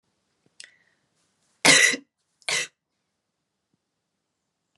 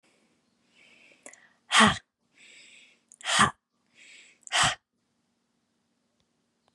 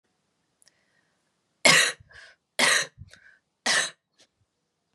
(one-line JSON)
{"cough_length": "4.8 s", "cough_amplitude": 25825, "cough_signal_mean_std_ratio": 0.23, "exhalation_length": "6.7 s", "exhalation_amplitude": 17738, "exhalation_signal_mean_std_ratio": 0.25, "three_cough_length": "4.9 s", "three_cough_amplitude": 23744, "three_cough_signal_mean_std_ratio": 0.3, "survey_phase": "beta (2021-08-13 to 2022-03-07)", "age": "18-44", "gender": "Female", "wearing_mask": "No", "symptom_shortness_of_breath": true, "symptom_sore_throat": true, "symptom_fatigue": true, "symptom_onset": "4 days", "smoker_status": "Never smoked", "respiratory_condition_asthma": false, "respiratory_condition_other": false, "recruitment_source": "Test and Trace", "submission_delay": "2 days", "covid_test_result": "Positive", "covid_test_method": "RT-qPCR", "covid_ct_value": 28.7, "covid_ct_gene": "N gene", "covid_ct_mean": 28.7, "covid_viral_load": "370 copies/ml", "covid_viral_load_category": "Minimal viral load (< 10K copies/ml)"}